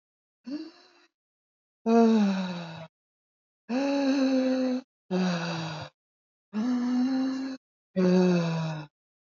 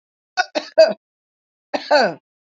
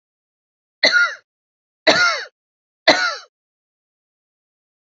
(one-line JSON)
{"exhalation_length": "9.4 s", "exhalation_amplitude": 9854, "exhalation_signal_mean_std_ratio": 0.64, "cough_length": "2.6 s", "cough_amplitude": 31224, "cough_signal_mean_std_ratio": 0.34, "three_cough_length": "4.9 s", "three_cough_amplitude": 29873, "three_cough_signal_mean_std_ratio": 0.33, "survey_phase": "beta (2021-08-13 to 2022-03-07)", "age": "45-64", "gender": "Female", "wearing_mask": "No", "symptom_none": true, "smoker_status": "Ex-smoker", "respiratory_condition_asthma": false, "respiratory_condition_other": false, "recruitment_source": "REACT", "submission_delay": "4 days", "covid_test_result": "Negative", "covid_test_method": "RT-qPCR"}